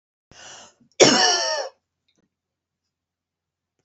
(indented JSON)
{
  "cough_length": "3.8 s",
  "cough_amplitude": 28035,
  "cough_signal_mean_std_ratio": 0.31,
  "survey_phase": "beta (2021-08-13 to 2022-03-07)",
  "age": "45-64",
  "gender": "Female",
  "wearing_mask": "No",
  "symptom_none": true,
  "smoker_status": "Never smoked",
  "respiratory_condition_asthma": false,
  "respiratory_condition_other": false,
  "recruitment_source": "REACT",
  "submission_delay": "2 days",
  "covid_test_result": "Negative",
  "covid_test_method": "RT-qPCR"
}